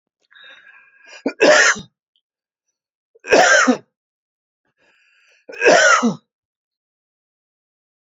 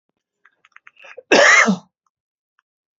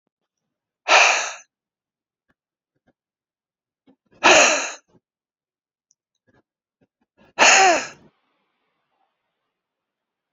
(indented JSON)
{
  "three_cough_length": "8.1 s",
  "three_cough_amplitude": 28989,
  "three_cough_signal_mean_std_ratio": 0.34,
  "cough_length": "3.0 s",
  "cough_amplitude": 29249,
  "cough_signal_mean_std_ratio": 0.32,
  "exhalation_length": "10.3 s",
  "exhalation_amplitude": 29912,
  "exhalation_signal_mean_std_ratio": 0.27,
  "survey_phase": "beta (2021-08-13 to 2022-03-07)",
  "age": "45-64",
  "gender": "Male",
  "wearing_mask": "No",
  "symptom_fatigue": true,
  "smoker_status": "Never smoked",
  "respiratory_condition_asthma": false,
  "respiratory_condition_other": false,
  "recruitment_source": "REACT",
  "submission_delay": "2 days",
  "covid_test_result": "Negative",
  "covid_test_method": "RT-qPCR",
  "influenza_a_test_result": "Negative",
  "influenza_b_test_result": "Negative"
}